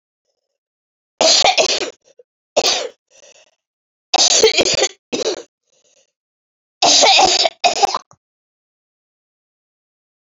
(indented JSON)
{
  "three_cough_length": "10.3 s",
  "three_cough_amplitude": 32768,
  "three_cough_signal_mean_std_ratio": 0.41,
  "survey_phase": "beta (2021-08-13 to 2022-03-07)",
  "age": "65+",
  "gender": "Female",
  "wearing_mask": "No",
  "symptom_cough_any": true,
  "symptom_new_continuous_cough": true,
  "symptom_shortness_of_breath": true,
  "symptom_fatigue": true,
  "symptom_headache": true,
  "symptom_onset": "7 days",
  "smoker_status": "Never smoked",
  "respiratory_condition_asthma": true,
  "respiratory_condition_other": false,
  "recruitment_source": "REACT",
  "submission_delay": "1 day",
  "covid_test_result": "Negative",
  "covid_test_method": "RT-qPCR",
  "influenza_a_test_result": "Negative",
  "influenza_b_test_result": "Negative"
}